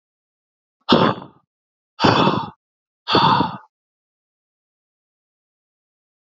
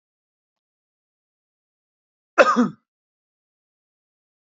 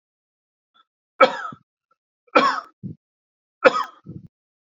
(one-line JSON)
{"exhalation_length": "6.2 s", "exhalation_amplitude": 29046, "exhalation_signal_mean_std_ratio": 0.34, "cough_length": "4.5 s", "cough_amplitude": 27016, "cough_signal_mean_std_ratio": 0.19, "three_cough_length": "4.6 s", "three_cough_amplitude": 31490, "three_cough_signal_mean_std_ratio": 0.26, "survey_phase": "beta (2021-08-13 to 2022-03-07)", "age": "18-44", "gender": "Male", "wearing_mask": "No", "symptom_cough_any": true, "symptom_runny_or_blocked_nose": true, "symptom_fatigue": true, "symptom_headache": true, "symptom_change_to_sense_of_smell_or_taste": true, "symptom_loss_of_taste": true, "symptom_onset": "4 days", "smoker_status": "Never smoked", "respiratory_condition_asthma": true, "respiratory_condition_other": false, "recruitment_source": "Test and Trace", "submission_delay": "1 day", "covid_test_result": "Positive", "covid_test_method": "RT-qPCR", "covid_ct_value": 24.2, "covid_ct_gene": "N gene"}